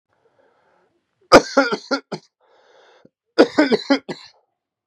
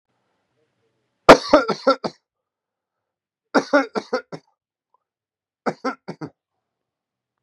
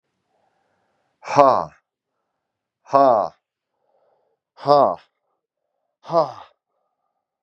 {
  "cough_length": "4.9 s",
  "cough_amplitude": 32768,
  "cough_signal_mean_std_ratio": 0.28,
  "three_cough_length": "7.4 s",
  "three_cough_amplitude": 32768,
  "three_cough_signal_mean_std_ratio": 0.22,
  "exhalation_length": "7.4 s",
  "exhalation_amplitude": 32768,
  "exhalation_signal_mean_std_ratio": 0.28,
  "survey_phase": "beta (2021-08-13 to 2022-03-07)",
  "age": "45-64",
  "gender": "Male",
  "wearing_mask": "No",
  "symptom_cough_any": true,
  "symptom_onset": "2 days",
  "smoker_status": "Prefer not to say",
  "respiratory_condition_asthma": false,
  "respiratory_condition_other": false,
  "recruitment_source": "Test and Trace",
  "submission_delay": "2 days",
  "covid_test_result": "Positive",
  "covid_test_method": "RT-qPCR",
  "covid_ct_value": 21.0,
  "covid_ct_gene": "ORF1ab gene",
  "covid_ct_mean": 21.7,
  "covid_viral_load": "76000 copies/ml",
  "covid_viral_load_category": "Low viral load (10K-1M copies/ml)"
}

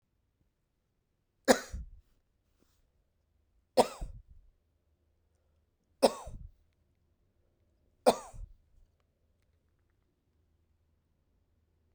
{
  "three_cough_length": "11.9 s",
  "three_cough_amplitude": 17406,
  "three_cough_signal_mean_std_ratio": 0.16,
  "survey_phase": "beta (2021-08-13 to 2022-03-07)",
  "age": "45-64",
  "gender": "Male",
  "wearing_mask": "No",
  "symptom_cough_any": true,
  "symptom_runny_or_blocked_nose": true,
  "symptom_abdominal_pain": true,
  "symptom_fever_high_temperature": true,
  "symptom_headache": true,
  "symptom_change_to_sense_of_smell_or_taste": true,
  "symptom_loss_of_taste": true,
  "smoker_status": "Never smoked",
  "respiratory_condition_asthma": false,
  "respiratory_condition_other": false,
  "recruitment_source": "Test and Trace",
  "submission_delay": "2 days",
  "covid_test_result": "Positive",
  "covid_test_method": "LFT"
}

